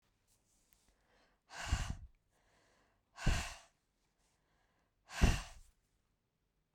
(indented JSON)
{
  "exhalation_length": "6.7 s",
  "exhalation_amplitude": 5025,
  "exhalation_signal_mean_std_ratio": 0.26,
  "survey_phase": "beta (2021-08-13 to 2022-03-07)",
  "age": "45-64",
  "gender": "Female",
  "wearing_mask": "No",
  "symptom_none": true,
  "smoker_status": "Never smoked",
  "respiratory_condition_asthma": false,
  "respiratory_condition_other": false,
  "recruitment_source": "REACT",
  "submission_delay": "1 day",
  "covid_test_method": "RT-qPCR",
  "influenza_a_test_result": "Unknown/Void",
  "influenza_b_test_result": "Unknown/Void"
}